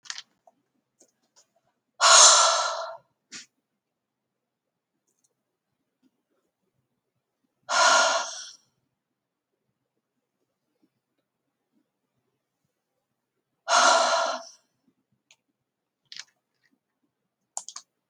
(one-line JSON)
{"exhalation_length": "18.1 s", "exhalation_amplitude": 29235, "exhalation_signal_mean_std_ratio": 0.26, "survey_phase": "beta (2021-08-13 to 2022-03-07)", "age": "65+", "gender": "Female", "wearing_mask": "No", "symptom_none": true, "smoker_status": "Never smoked", "respiratory_condition_asthma": false, "respiratory_condition_other": false, "recruitment_source": "REACT", "submission_delay": "0 days", "covid_test_result": "Negative", "covid_test_method": "RT-qPCR"}